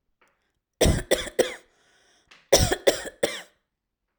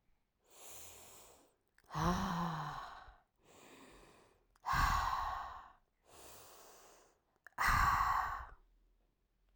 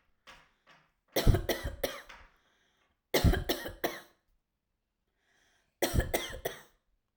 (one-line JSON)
{"cough_length": "4.2 s", "cough_amplitude": 28112, "cough_signal_mean_std_ratio": 0.35, "exhalation_length": "9.6 s", "exhalation_amplitude": 3338, "exhalation_signal_mean_std_ratio": 0.47, "three_cough_length": "7.2 s", "three_cough_amplitude": 11281, "three_cough_signal_mean_std_ratio": 0.34, "survey_phase": "alpha (2021-03-01 to 2021-08-12)", "age": "18-44", "gender": "Female", "wearing_mask": "No", "symptom_none": true, "smoker_status": "Ex-smoker", "respiratory_condition_asthma": false, "respiratory_condition_other": false, "recruitment_source": "REACT", "submission_delay": "1 day", "covid_test_result": "Negative", "covid_test_method": "RT-qPCR"}